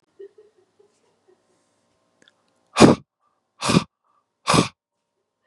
{
  "exhalation_length": "5.5 s",
  "exhalation_amplitude": 32768,
  "exhalation_signal_mean_std_ratio": 0.23,
  "survey_phase": "beta (2021-08-13 to 2022-03-07)",
  "age": "18-44",
  "gender": "Male",
  "wearing_mask": "No",
  "symptom_cough_any": true,
  "symptom_new_continuous_cough": true,
  "symptom_sore_throat": true,
  "symptom_fatigue": true,
  "symptom_change_to_sense_of_smell_or_taste": true,
  "symptom_onset": "5 days",
  "smoker_status": "Ex-smoker",
  "respiratory_condition_asthma": false,
  "respiratory_condition_other": false,
  "recruitment_source": "Test and Trace",
  "submission_delay": "2 days",
  "covid_test_result": "Positive",
  "covid_test_method": "RT-qPCR",
  "covid_ct_value": 18.2,
  "covid_ct_gene": "ORF1ab gene",
  "covid_ct_mean": 18.5,
  "covid_viral_load": "850000 copies/ml",
  "covid_viral_load_category": "Low viral load (10K-1M copies/ml)"
}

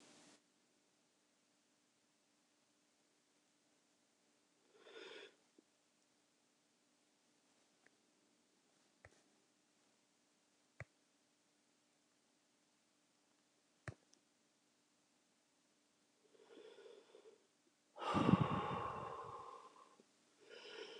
{
  "exhalation_length": "21.0 s",
  "exhalation_amplitude": 3414,
  "exhalation_signal_mean_std_ratio": 0.22,
  "survey_phase": "alpha (2021-03-01 to 2021-08-12)",
  "age": "65+",
  "gender": "Female",
  "wearing_mask": "No",
  "symptom_diarrhoea": true,
  "smoker_status": "Ex-smoker",
  "respiratory_condition_asthma": false,
  "respiratory_condition_other": false,
  "recruitment_source": "REACT",
  "submission_delay": "2 days",
  "covid_test_result": "Negative",
  "covid_test_method": "RT-qPCR"
}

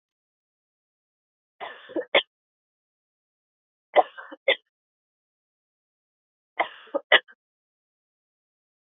{
  "three_cough_length": "8.9 s",
  "three_cough_amplitude": 22595,
  "three_cough_signal_mean_std_ratio": 0.17,
  "survey_phase": "beta (2021-08-13 to 2022-03-07)",
  "age": "18-44",
  "gender": "Female",
  "wearing_mask": "No",
  "symptom_abdominal_pain": true,
  "symptom_fatigue": true,
  "smoker_status": "Never smoked",
  "respiratory_condition_asthma": false,
  "respiratory_condition_other": false,
  "recruitment_source": "REACT",
  "submission_delay": "4 days",
  "covid_test_result": "Negative",
  "covid_test_method": "RT-qPCR"
}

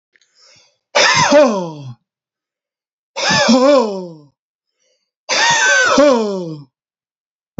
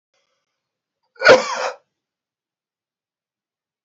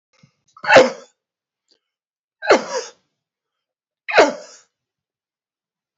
{
  "exhalation_length": "7.6 s",
  "exhalation_amplitude": 30587,
  "exhalation_signal_mean_std_ratio": 0.52,
  "cough_length": "3.8 s",
  "cough_amplitude": 31572,
  "cough_signal_mean_std_ratio": 0.22,
  "three_cough_length": "6.0 s",
  "three_cough_amplitude": 29161,
  "three_cough_signal_mean_std_ratio": 0.26,
  "survey_phase": "beta (2021-08-13 to 2022-03-07)",
  "age": "45-64",
  "gender": "Male",
  "wearing_mask": "No",
  "symptom_none": true,
  "smoker_status": "Ex-smoker",
  "respiratory_condition_asthma": false,
  "respiratory_condition_other": false,
  "recruitment_source": "REACT",
  "submission_delay": "2 days",
  "covid_test_result": "Negative",
  "covid_test_method": "RT-qPCR"
}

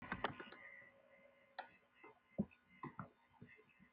{
  "exhalation_length": "3.9 s",
  "exhalation_amplitude": 1841,
  "exhalation_signal_mean_std_ratio": 0.38,
  "survey_phase": "beta (2021-08-13 to 2022-03-07)",
  "age": "65+",
  "gender": "Female",
  "wearing_mask": "No",
  "symptom_runny_or_blocked_nose": true,
  "smoker_status": "Never smoked",
  "respiratory_condition_asthma": false,
  "respiratory_condition_other": false,
  "recruitment_source": "REACT",
  "submission_delay": "1 day",
  "covid_test_result": "Negative",
  "covid_test_method": "RT-qPCR",
  "influenza_a_test_result": "Negative",
  "influenza_b_test_result": "Negative"
}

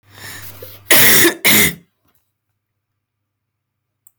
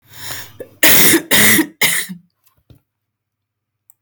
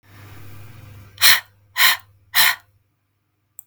{
  "cough_length": "4.2 s",
  "cough_amplitude": 32768,
  "cough_signal_mean_std_ratio": 0.39,
  "three_cough_length": "4.0 s",
  "three_cough_amplitude": 32768,
  "three_cough_signal_mean_std_ratio": 0.46,
  "exhalation_length": "3.7 s",
  "exhalation_amplitude": 32768,
  "exhalation_signal_mean_std_ratio": 0.34,
  "survey_phase": "beta (2021-08-13 to 2022-03-07)",
  "age": "18-44",
  "gender": "Female",
  "wearing_mask": "No",
  "symptom_cough_any": true,
  "symptom_fatigue": true,
  "symptom_other": true,
  "symptom_onset": "2 days",
  "smoker_status": "Ex-smoker",
  "respiratory_condition_asthma": false,
  "respiratory_condition_other": false,
  "recruitment_source": "Test and Trace",
  "submission_delay": "1 day",
  "covid_test_result": "Positive",
  "covid_test_method": "RT-qPCR",
  "covid_ct_value": 18.9,
  "covid_ct_gene": "N gene"
}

